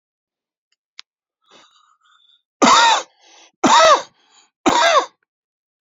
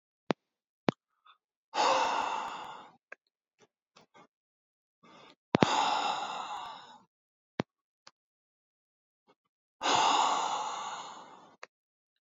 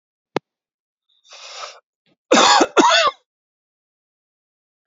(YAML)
three_cough_length: 5.8 s
three_cough_amplitude: 32767
three_cough_signal_mean_std_ratio: 0.37
exhalation_length: 12.2 s
exhalation_amplitude: 27789
exhalation_signal_mean_std_ratio: 0.38
cough_length: 4.9 s
cough_amplitude: 32767
cough_signal_mean_std_ratio: 0.33
survey_phase: beta (2021-08-13 to 2022-03-07)
age: 18-44
gender: Male
wearing_mask: 'No'
symptom_cough_any: true
symptom_sore_throat: true
symptom_fatigue: true
symptom_onset: 9 days
smoker_status: Ex-smoker
respiratory_condition_asthma: false
respiratory_condition_other: false
recruitment_source: REACT
submission_delay: 1 day
covid_test_result: Positive
covid_test_method: RT-qPCR
covid_ct_value: 20.0
covid_ct_gene: E gene
influenza_a_test_result: Negative
influenza_b_test_result: Negative